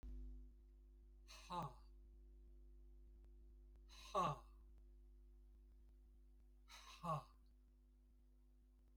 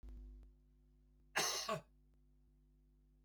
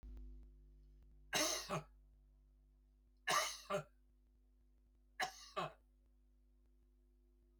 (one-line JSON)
{"exhalation_length": "9.0 s", "exhalation_amplitude": 913, "exhalation_signal_mean_std_ratio": 0.51, "cough_length": "3.2 s", "cough_amplitude": 2254, "cough_signal_mean_std_ratio": 0.4, "three_cough_length": "7.6 s", "three_cough_amplitude": 2077, "three_cough_signal_mean_std_ratio": 0.39, "survey_phase": "beta (2021-08-13 to 2022-03-07)", "age": "65+", "gender": "Male", "wearing_mask": "No", "symptom_none": true, "smoker_status": "Ex-smoker", "respiratory_condition_asthma": false, "respiratory_condition_other": false, "recruitment_source": "REACT", "submission_delay": "1 day", "covid_test_result": "Negative", "covid_test_method": "RT-qPCR"}